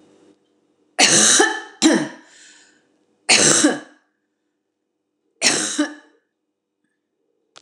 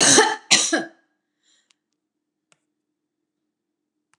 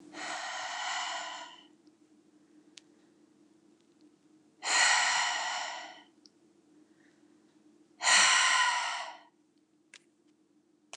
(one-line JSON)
{"three_cough_length": "7.6 s", "three_cough_amplitude": 29203, "three_cough_signal_mean_std_ratio": 0.39, "cough_length": "4.2 s", "cough_amplitude": 29203, "cough_signal_mean_std_ratio": 0.3, "exhalation_length": "11.0 s", "exhalation_amplitude": 9109, "exhalation_signal_mean_std_ratio": 0.43, "survey_phase": "beta (2021-08-13 to 2022-03-07)", "age": "45-64", "gender": "Female", "wearing_mask": "No", "symptom_none": true, "smoker_status": "Never smoked", "respiratory_condition_asthma": false, "respiratory_condition_other": false, "recruitment_source": "REACT", "submission_delay": "1 day", "covid_test_result": "Negative", "covid_test_method": "RT-qPCR"}